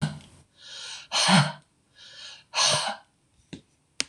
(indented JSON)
{
  "exhalation_length": "4.1 s",
  "exhalation_amplitude": 25241,
  "exhalation_signal_mean_std_ratio": 0.41,
  "survey_phase": "beta (2021-08-13 to 2022-03-07)",
  "age": "65+",
  "gender": "Female",
  "wearing_mask": "No",
  "symptom_none": true,
  "smoker_status": "Ex-smoker",
  "respiratory_condition_asthma": false,
  "respiratory_condition_other": false,
  "recruitment_source": "REACT",
  "submission_delay": "1 day",
  "covid_test_result": "Negative",
  "covid_test_method": "RT-qPCR",
  "influenza_a_test_result": "Negative",
  "influenza_b_test_result": "Negative"
}